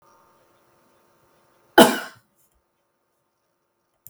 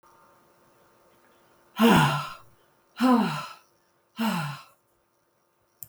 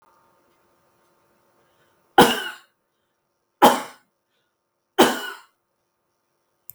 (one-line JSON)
{"cough_length": "4.1 s", "cough_amplitude": 32766, "cough_signal_mean_std_ratio": 0.16, "exhalation_length": "5.9 s", "exhalation_amplitude": 14064, "exhalation_signal_mean_std_ratio": 0.37, "three_cough_length": "6.7 s", "three_cough_amplitude": 32768, "three_cough_signal_mean_std_ratio": 0.22, "survey_phase": "beta (2021-08-13 to 2022-03-07)", "age": "45-64", "gender": "Female", "wearing_mask": "No", "symptom_none": true, "smoker_status": "Never smoked", "respiratory_condition_asthma": false, "respiratory_condition_other": false, "recruitment_source": "REACT", "submission_delay": "4 days", "covid_test_result": "Negative", "covid_test_method": "RT-qPCR", "influenza_a_test_result": "Negative", "influenza_b_test_result": "Negative"}